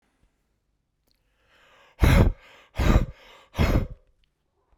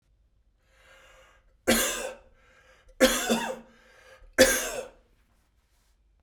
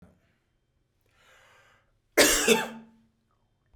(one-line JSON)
{"exhalation_length": "4.8 s", "exhalation_amplitude": 18555, "exhalation_signal_mean_std_ratio": 0.35, "three_cough_length": "6.2 s", "three_cough_amplitude": 22101, "three_cough_signal_mean_std_ratio": 0.34, "cough_length": "3.8 s", "cough_amplitude": 17976, "cough_signal_mean_std_ratio": 0.28, "survey_phase": "beta (2021-08-13 to 2022-03-07)", "age": "45-64", "gender": "Male", "wearing_mask": "No", "symptom_none": true, "symptom_onset": "6 days", "smoker_status": "Never smoked", "respiratory_condition_asthma": false, "respiratory_condition_other": false, "recruitment_source": "REACT", "submission_delay": "2 days", "covid_test_result": "Negative", "covid_test_method": "RT-qPCR"}